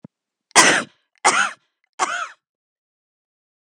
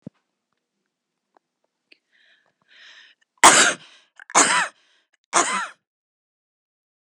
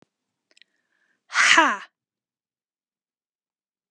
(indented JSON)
{
  "cough_length": "3.6 s",
  "cough_amplitude": 32768,
  "cough_signal_mean_std_ratio": 0.33,
  "three_cough_length": "7.1 s",
  "three_cough_amplitude": 32768,
  "three_cough_signal_mean_std_ratio": 0.26,
  "exhalation_length": "3.9 s",
  "exhalation_amplitude": 27896,
  "exhalation_signal_mean_std_ratio": 0.25,
  "survey_phase": "beta (2021-08-13 to 2022-03-07)",
  "age": "18-44",
  "gender": "Female",
  "wearing_mask": "No",
  "symptom_none": true,
  "symptom_onset": "13 days",
  "smoker_status": "Never smoked",
  "respiratory_condition_asthma": true,
  "respiratory_condition_other": false,
  "recruitment_source": "REACT",
  "submission_delay": "0 days",
  "covid_test_result": "Negative",
  "covid_test_method": "RT-qPCR",
  "influenza_a_test_result": "Negative",
  "influenza_b_test_result": "Negative"
}